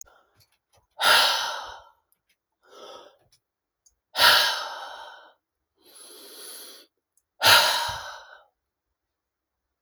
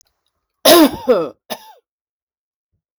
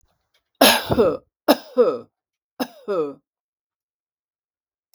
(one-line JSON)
{"exhalation_length": "9.8 s", "exhalation_amplitude": 23861, "exhalation_signal_mean_std_ratio": 0.33, "cough_length": "3.0 s", "cough_amplitude": 32768, "cough_signal_mean_std_ratio": 0.33, "three_cough_length": "4.9 s", "three_cough_amplitude": 32768, "three_cough_signal_mean_std_ratio": 0.34, "survey_phase": "beta (2021-08-13 to 2022-03-07)", "age": "65+", "gender": "Female", "wearing_mask": "No", "symptom_none": true, "smoker_status": "Never smoked", "respiratory_condition_asthma": false, "respiratory_condition_other": false, "recruitment_source": "REACT", "submission_delay": "2 days", "covid_test_result": "Negative", "covid_test_method": "RT-qPCR"}